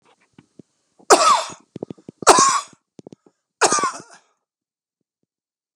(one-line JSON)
{"three_cough_length": "5.8 s", "three_cough_amplitude": 32768, "three_cough_signal_mean_std_ratio": 0.32, "survey_phase": "beta (2021-08-13 to 2022-03-07)", "age": "65+", "gender": "Male", "wearing_mask": "No", "symptom_none": true, "smoker_status": "Ex-smoker", "respiratory_condition_asthma": false, "respiratory_condition_other": false, "recruitment_source": "REACT", "submission_delay": "2 days", "covid_test_result": "Negative", "covid_test_method": "RT-qPCR", "influenza_a_test_result": "Negative", "influenza_b_test_result": "Negative"}